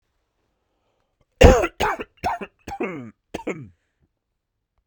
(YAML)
cough_length: 4.9 s
cough_amplitude: 32768
cough_signal_mean_std_ratio: 0.27
survey_phase: beta (2021-08-13 to 2022-03-07)
age: 45-64
gender: Male
wearing_mask: 'No'
symptom_cough_any: true
symptom_fatigue: true
symptom_fever_high_temperature: true
symptom_headache: true
symptom_change_to_sense_of_smell_or_taste: true
symptom_onset: 3 days
smoker_status: Never smoked
respiratory_condition_asthma: false
respiratory_condition_other: false
recruitment_source: Test and Trace
submission_delay: 2 days
covid_test_result: Positive
covid_test_method: RT-qPCR
covid_ct_value: 24.9
covid_ct_gene: ORF1ab gene